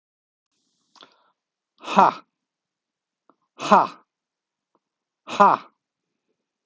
{
  "exhalation_length": "6.7 s",
  "exhalation_amplitude": 32641,
  "exhalation_signal_mean_std_ratio": 0.22,
  "survey_phase": "alpha (2021-03-01 to 2021-08-12)",
  "age": "65+",
  "gender": "Male",
  "wearing_mask": "No",
  "symptom_cough_any": true,
  "symptom_fatigue": true,
  "symptom_headache": true,
  "symptom_onset": "5 days",
  "smoker_status": "Ex-smoker",
  "respiratory_condition_asthma": false,
  "respiratory_condition_other": false,
  "recruitment_source": "Test and Trace",
  "submission_delay": "2 days",
  "covid_test_result": "Positive",
  "covid_test_method": "RT-qPCR",
  "covid_ct_value": 33.3,
  "covid_ct_gene": "ORF1ab gene"
}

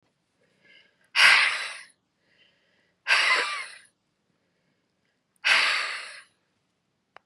{
  "exhalation_length": "7.3 s",
  "exhalation_amplitude": 19271,
  "exhalation_signal_mean_std_ratio": 0.36,
  "survey_phase": "beta (2021-08-13 to 2022-03-07)",
  "age": "45-64",
  "gender": "Female",
  "wearing_mask": "No",
  "symptom_cough_any": true,
  "symptom_new_continuous_cough": true,
  "symptom_runny_or_blocked_nose": true,
  "symptom_fatigue": true,
  "symptom_change_to_sense_of_smell_or_taste": true,
  "symptom_onset": "3 days",
  "smoker_status": "Ex-smoker",
  "respiratory_condition_asthma": false,
  "respiratory_condition_other": false,
  "recruitment_source": "Test and Trace",
  "submission_delay": "2 days",
  "covid_test_result": "Positive",
  "covid_test_method": "RT-qPCR",
  "covid_ct_value": 21.6,
  "covid_ct_gene": "ORF1ab gene",
  "covid_ct_mean": 22.1,
  "covid_viral_load": "57000 copies/ml",
  "covid_viral_load_category": "Low viral load (10K-1M copies/ml)"
}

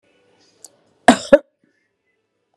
{
  "cough_length": "2.6 s",
  "cough_amplitude": 32768,
  "cough_signal_mean_std_ratio": 0.18,
  "survey_phase": "beta (2021-08-13 to 2022-03-07)",
  "age": "65+",
  "gender": "Female",
  "wearing_mask": "No",
  "symptom_none": true,
  "smoker_status": "Never smoked",
  "respiratory_condition_asthma": false,
  "respiratory_condition_other": false,
  "recruitment_source": "REACT",
  "submission_delay": "1 day",
  "covid_test_result": "Negative",
  "covid_test_method": "RT-qPCR",
  "influenza_a_test_result": "Unknown/Void",
  "influenza_b_test_result": "Unknown/Void"
}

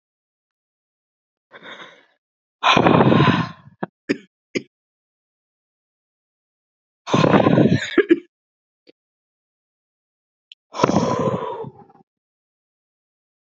{
  "exhalation_length": "13.5 s",
  "exhalation_amplitude": 32768,
  "exhalation_signal_mean_std_ratio": 0.33,
  "survey_phase": "beta (2021-08-13 to 2022-03-07)",
  "age": "18-44",
  "gender": "Female",
  "wearing_mask": "No",
  "symptom_runny_or_blocked_nose": true,
  "symptom_shortness_of_breath": true,
  "symptom_fatigue": true,
  "symptom_change_to_sense_of_smell_or_taste": true,
  "symptom_onset": "4 days",
  "smoker_status": "Ex-smoker",
  "respiratory_condition_asthma": false,
  "respiratory_condition_other": false,
  "recruitment_source": "Test and Trace",
  "submission_delay": "2 days",
  "covid_test_result": "Positive",
  "covid_test_method": "RT-qPCR",
  "covid_ct_value": 20.8,
  "covid_ct_gene": "ORF1ab gene",
  "covid_ct_mean": 21.6,
  "covid_viral_load": "83000 copies/ml",
  "covid_viral_load_category": "Low viral load (10K-1M copies/ml)"
}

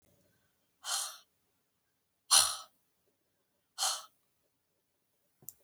{
  "exhalation_length": "5.6 s",
  "exhalation_amplitude": 11297,
  "exhalation_signal_mean_std_ratio": 0.24,
  "survey_phase": "alpha (2021-03-01 to 2021-08-12)",
  "age": "45-64",
  "gender": "Female",
  "wearing_mask": "No",
  "symptom_none": true,
  "smoker_status": "Never smoked",
  "respiratory_condition_asthma": false,
  "respiratory_condition_other": false,
  "recruitment_source": "REACT",
  "submission_delay": "2 days",
  "covid_test_result": "Negative",
  "covid_test_method": "RT-qPCR"
}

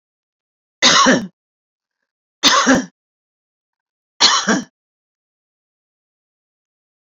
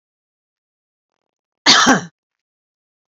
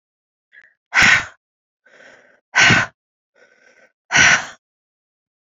{
  "three_cough_length": "7.1 s",
  "three_cough_amplitude": 32767,
  "three_cough_signal_mean_std_ratio": 0.33,
  "cough_length": "3.1 s",
  "cough_amplitude": 32768,
  "cough_signal_mean_std_ratio": 0.27,
  "exhalation_length": "5.5 s",
  "exhalation_amplitude": 32767,
  "exhalation_signal_mean_std_ratio": 0.33,
  "survey_phase": "beta (2021-08-13 to 2022-03-07)",
  "age": "65+",
  "gender": "Female",
  "wearing_mask": "No",
  "symptom_none": true,
  "smoker_status": "Ex-smoker",
  "respiratory_condition_asthma": false,
  "respiratory_condition_other": false,
  "recruitment_source": "REACT",
  "submission_delay": "2 days",
  "covid_test_result": "Negative",
  "covid_test_method": "RT-qPCR",
  "influenza_a_test_result": "Negative",
  "influenza_b_test_result": "Negative"
}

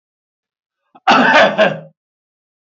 {
  "cough_length": "2.7 s",
  "cough_amplitude": 32767,
  "cough_signal_mean_std_ratio": 0.4,
  "survey_phase": "beta (2021-08-13 to 2022-03-07)",
  "age": "65+",
  "gender": "Male",
  "wearing_mask": "No",
  "symptom_none": true,
  "smoker_status": "Never smoked",
  "respiratory_condition_asthma": false,
  "respiratory_condition_other": false,
  "recruitment_source": "Test and Trace",
  "submission_delay": "1 day",
  "covid_test_result": "Positive",
  "covid_test_method": "RT-qPCR",
  "covid_ct_value": 36.2,
  "covid_ct_gene": "ORF1ab gene"
}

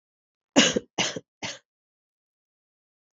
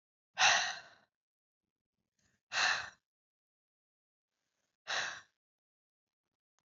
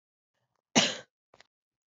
{
  "three_cough_length": "3.2 s",
  "three_cough_amplitude": 21754,
  "three_cough_signal_mean_std_ratio": 0.26,
  "exhalation_length": "6.7 s",
  "exhalation_amplitude": 6933,
  "exhalation_signal_mean_std_ratio": 0.28,
  "cough_length": "2.0 s",
  "cough_amplitude": 15083,
  "cough_signal_mean_std_ratio": 0.22,
  "survey_phase": "beta (2021-08-13 to 2022-03-07)",
  "age": "18-44",
  "gender": "Female",
  "wearing_mask": "No",
  "symptom_cough_any": true,
  "symptom_new_continuous_cough": true,
  "symptom_runny_or_blocked_nose": true,
  "symptom_shortness_of_breath": true,
  "symptom_sore_throat": true,
  "symptom_fatigue": true,
  "symptom_fever_high_temperature": true,
  "symptom_headache": true,
  "symptom_change_to_sense_of_smell_or_taste": true,
  "symptom_onset": "3 days",
  "smoker_status": "Ex-smoker",
  "respiratory_condition_asthma": false,
  "respiratory_condition_other": false,
  "recruitment_source": "Test and Trace",
  "submission_delay": "2 days",
  "covid_test_result": "Positive",
  "covid_test_method": "RT-qPCR",
  "covid_ct_value": 19.6,
  "covid_ct_gene": "N gene"
}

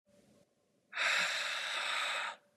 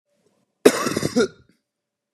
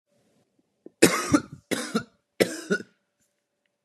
{
  "exhalation_length": "2.6 s",
  "exhalation_amplitude": 3486,
  "exhalation_signal_mean_std_ratio": 0.69,
  "cough_length": "2.1 s",
  "cough_amplitude": 32768,
  "cough_signal_mean_std_ratio": 0.32,
  "three_cough_length": "3.8 s",
  "three_cough_amplitude": 29525,
  "three_cough_signal_mean_std_ratio": 0.31,
  "survey_phase": "beta (2021-08-13 to 2022-03-07)",
  "age": "18-44",
  "gender": "Male",
  "wearing_mask": "No",
  "symptom_cough_any": true,
  "symptom_runny_or_blocked_nose": true,
  "symptom_onset": "8 days",
  "smoker_status": "Never smoked",
  "respiratory_condition_asthma": false,
  "respiratory_condition_other": false,
  "recruitment_source": "REACT",
  "submission_delay": "0 days",
  "covid_test_result": "Negative",
  "covid_test_method": "RT-qPCR",
  "influenza_a_test_result": "Negative",
  "influenza_b_test_result": "Negative"
}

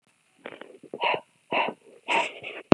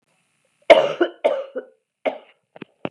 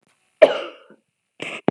{
  "exhalation_length": "2.7 s",
  "exhalation_amplitude": 32768,
  "exhalation_signal_mean_std_ratio": 0.33,
  "three_cough_length": "2.9 s",
  "three_cough_amplitude": 32768,
  "three_cough_signal_mean_std_ratio": 0.31,
  "cough_length": "1.7 s",
  "cough_amplitude": 32768,
  "cough_signal_mean_std_ratio": 0.24,
  "survey_phase": "beta (2021-08-13 to 2022-03-07)",
  "age": "18-44",
  "gender": "Female",
  "wearing_mask": "No",
  "symptom_cough_any": true,
  "symptom_runny_or_blocked_nose": true,
  "symptom_fatigue": true,
  "symptom_onset": "3 days",
  "smoker_status": "Never smoked",
  "respiratory_condition_asthma": false,
  "respiratory_condition_other": false,
  "recruitment_source": "Test and Trace",
  "submission_delay": "2 days",
  "covid_test_result": "Positive",
  "covid_test_method": "RT-qPCR",
  "covid_ct_value": 24.7,
  "covid_ct_gene": "N gene"
}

